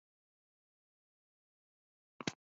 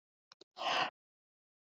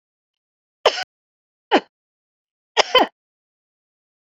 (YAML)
cough_length: 2.5 s
cough_amplitude: 3131
cough_signal_mean_std_ratio: 0.09
exhalation_length: 1.8 s
exhalation_amplitude: 3108
exhalation_signal_mean_std_ratio: 0.33
three_cough_length: 4.4 s
three_cough_amplitude: 32768
three_cough_signal_mean_std_ratio: 0.21
survey_phase: beta (2021-08-13 to 2022-03-07)
age: 45-64
gender: Female
wearing_mask: 'No'
symptom_none: true
smoker_status: Never smoked
respiratory_condition_asthma: true
respiratory_condition_other: false
recruitment_source: REACT
submission_delay: 6 days
covid_test_result: Negative
covid_test_method: RT-qPCR